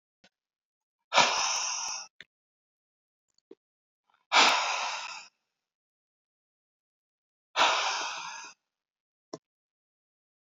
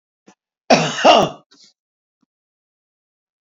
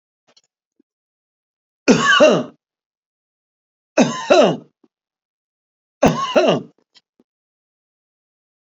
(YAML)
exhalation_length: 10.4 s
exhalation_amplitude: 16156
exhalation_signal_mean_std_ratio: 0.34
cough_length: 3.4 s
cough_amplitude: 29438
cough_signal_mean_std_ratio: 0.29
three_cough_length: 8.8 s
three_cough_amplitude: 32076
three_cough_signal_mean_std_ratio: 0.32
survey_phase: beta (2021-08-13 to 2022-03-07)
age: 65+
gender: Male
wearing_mask: 'No'
symptom_none: true
smoker_status: Ex-smoker
respiratory_condition_asthma: false
respiratory_condition_other: false
recruitment_source: REACT
submission_delay: 3 days
covid_test_result: Negative
covid_test_method: RT-qPCR